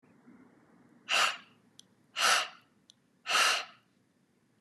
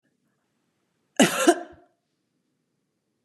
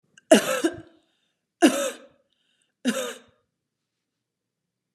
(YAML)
exhalation_length: 4.6 s
exhalation_amplitude: 7033
exhalation_signal_mean_std_ratio: 0.38
cough_length: 3.2 s
cough_amplitude: 22590
cough_signal_mean_std_ratio: 0.24
three_cough_length: 4.9 s
three_cough_amplitude: 28080
three_cough_signal_mean_std_ratio: 0.28
survey_phase: beta (2021-08-13 to 2022-03-07)
age: 45-64
gender: Female
wearing_mask: 'No'
symptom_runny_or_blocked_nose: true
symptom_headache: true
symptom_onset: 4 days
smoker_status: Never smoked
respiratory_condition_asthma: false
respiratory_condition_other: false
recruitment_source: REACT
submission_delay: 1 day
covid_test_result: Negative
covid_test_method: RT-qPCR
influenza_a_test_result: Negative
influenza_b_test_result: Negative